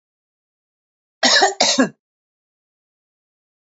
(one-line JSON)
{"cough_length": "3.7 s", "cough_amplitude": 32768, "cough_signal_mean_std_ratio": 0.31, "survey_phase": "beta (2021-08-13 to 2022-03-07)", "age": "65+", "gender": "Female", "wearing_mask": "No", "symptom_none": true, "smoker_status": "Ex-smoker", "respiratory_condition_asthma": false, "respiratory_condition_other": false, "recruitment_source": "REACT", "submission_delay": "2 days", "covid_test_result": "Negative", "covid_test_method": "RT-qPCR", "influenza_a_test_result": "Negative", "influenza_b_test_result": "Negative"}